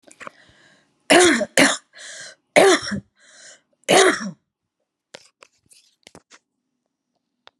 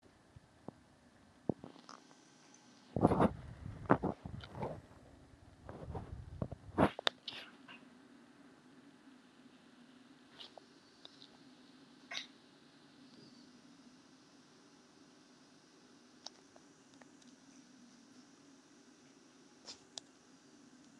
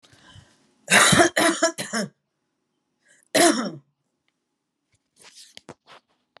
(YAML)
three_cough_length: 7.6 s
three_cough_amplitude: 32768
three_cough_signal_mean_std_ratio: 0.32
exhalation_length: 21.0 s
exhalation_amplitude: 13534
exhalation_signal_mean_std_ratio: 0.27
cough_length: 6.4 s
cough_amplitude: 26056
cough_signal_mean_std_ratio: 0.34
survey_phase: alpha (2021-03-01 to 2021-08-12)
age: 45-64
gender: Female
wearing_mask: 'No'
symptom_cough_any: true
smoker_status: Current smoker (e-cigarettes or vapes only)
respiratory_condition_asthma: false
respiratory_condition_other: false
recruitment_source: Test and Trace
submission_delay: 2 days
covid_test_result: Positive
covid_test_method: RT-qPCR